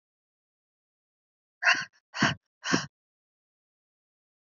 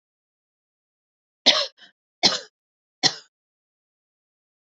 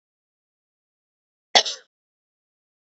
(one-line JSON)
{"exhalation_length": "4.4 s", "exhalation_amplitude": 13043, "exhalation_signal_mean_std_ratio": 0.25, "three_cough_length": "4.8 s", "three_cough_amplitude": 32768, "three_cough_signal_mean_std_ratio": 0.21, "cough_length": "3.0 s", "cough_amplitude": 31850, "cough_signal_mean_std_ratio": 0.14, "survey_phase": "beta (2021-08-13 to 2022-03-07)", "age": "18-44", "gender": "Female", "wearing_mask": "No", "symptom_none": true, "symptom_onset": "12 days", "smoker_status": "Current smoker (1 to 10 cigarettes per day)", "respiratory_condition_asthma": false, "respiratory_condition_other": false, "recruitment_source": "REACT", "submission_delay": "0 days", "covid_test_result": "Negative", "covid_test_method": "RT-qPCR", "influenza_a_test_result": "Negative", "influenza_b_test_result": "Negative"}